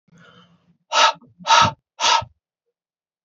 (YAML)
exhalation_length: 3.2 s
exhalation_amplitude: 26858
exhalation_signal_mean_std_ratio: 0.36
survey_phase: alpha (2021-03-01 to 2021-08-12)
age: 45-64
gender: Male
wearing_mask: 'No'
symptom_none: true
smoker_status: Never smoked
respiratory_condition_asthma: false
respiratory_condition_other: false
recruitment_source: REACT
submission_delay: 1 day
covid_test_result: Negative
covid_test_method: RT-qPCR